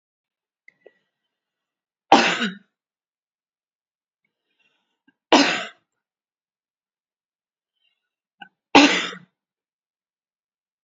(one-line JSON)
{"three_cough_length": "10.8 s", "three_cough_amplitude": 32767, "three_cough_signal_mean_std_ratio": 0.21, "survey_phase": "beta (2021-08-13 to 2022-03-07)", "age": "45-64", "gender": "Female", "wearing_mask": "No", "symptom_none": true, "smoker_status": "Ex-smoker", "respiratory_condition_asthma": false, "respiratory_condition_other": false, "recruitment_source": "REACT", "submission_delay": "2 days", "covid_test_result": "Negative", "covid_test_method": "RT-qPCR", "influenza_a_test_result": "Negative", "influenza_b_test_result": "Negative"}